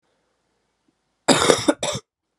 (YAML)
cough_length: 2.4 s
cough_amplitude: 32768
cough_signal_mean_std_ratio: 0.33
survey_phase: alpha (2021-03-01 to 2021-08-12)
age: 18-44
gender: Female
wearing_mask: 'No'
symptom_cough_any: true
symptom_fatigue: true
symptom_fever_high_temperature: true
symptom_headache: true
symptom_onset: 3 days
smoker_status: Never smoked
respiratory_condition_asthma: false
respiratory_condition_other: false
recruitment_source: Test and Trace
submission_delay: 1 day
covid_test_result: Positive
covid_test_method: RT-qPCR